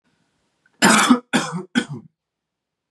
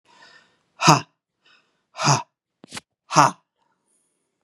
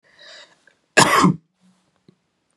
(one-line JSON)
{"three_cough_length": "2.9 s", "three_cough_amplitude": 29675, "three_cough_signal_mean_std_ratio": 0.38, "exhalation_length": "4.4 s", "exhalation_amplitude": 32767, "exhalation_signal_mean_std_ratio": 0.26, "cough_length": "2.6 s", "cough_amplitude": 32768, "cough_signal_mean_std_ratio": 0.3, "survey_phase": "beta (2021-08-13 to 2022-03-07)", "age": "18-44", "gender": "Male", "wearing_mask": "No", "symptom_none": true, "smoker_status": "Never smoked", "respiratory_condition_asthma": false, "respiratory_condition_other": false, "recruitment_source": "REACT", "submission_delay": "1 day", "covid_test_result": "Negative", "covid_test_method": "RT-qPCR", "influenza_a_test_result": "Negative", "influenza_b_test_result": "Negative"}